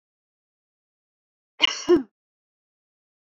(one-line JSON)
{"cough_length": "3.3 s", "cough_amplitude": 26542, "cough_signal_mean_std_ratio": 0.21, "survey_phase": "beta (2021-08-13 to 2022-03-07)", "age": "18-44", "gender": "Female", "wearing_mask": "No", "symptom_none": true, "symptom_onset": "3 days", "smoker_status": "Never smoked", "respiratory_condition_asthma": false, "respiratory_condition_other": false, "recruitment_source": "REACT", "submission_delay": "1 day", "covid_test_result": "Negative", "covid_test_method": "RT-qPCR", "influenza_a_test_result": "Unknown/Void", "influenza_b_test_result": "Unknown/Void"}